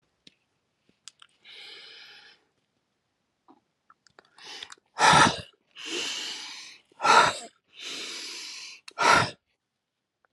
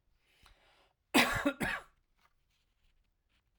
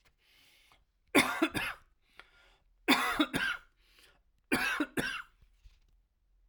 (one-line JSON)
{"exhalation_length": "10.3 s", "exhalation_amplitude": 18823, "exhalation_signal_mean_std_ratio": 0.31, "cough_length": "3.6 s", "cough_amplitude": 7620, "cough_signal_mean_std_ratio": 0.29, "three_cough_length": "6.5 s", "three_cough_amplitude": 10940, "three_cough_signal_mean_std_ratio": 0.39, "survey_phase": "alpha (2021-03-01 to 2021-08-12)", "age": "45-64", "gender": "Male", "wearing_mask": "No", "symptom_cough_any": true, "symptom_shortness_of_breath": true, "symptom_fatigue": true, "symptom_headache": true, "symptom_change_to_sense_of_smell_or_taste": true, "symptom_loss_of_taste": true, "smoker_status": "Never smoked", "respiratory_condition_asthma": false, "respiratory_condition_other": false, "recruitment_source": "Test and Trace", "submission_delay": "1 day", "covid_test_result": "Positive", "covid_test_method": "RT-qPCR", "covid_ct_value": 18.2, "covid_ct_gene": "S gene", "covid_ct_mean": 18.4, "covid_viral_load": "890000 copies/ml", "covid_viral_load_category": "Low viral load (10K-1M copies/ml)"}